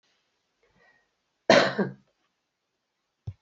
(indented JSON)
{
  "cough_length": "3.4 s",
  "cough_amplitude": 25033,
  "cough_signal_mean_std_ratio": 0.23,
  "survey_phase": "beta (2021-08-13 to 2022-03-07)",
  "age": "65+",
  "gender": "Female",
  "wearing_mask": "No",
  "symptom_none": true,
  "smoker_status": "Current smoker (e-cigarettes or vapes only)",
  "respiratory_condition_asthma": false,
  "respiratory_condition_other": false,
  "recruitment_source": "REACT",
  "submission_delay": "2 days",
  "covid_test_result": "Negative",
  "covid_test_method": "RT-qPCR"
}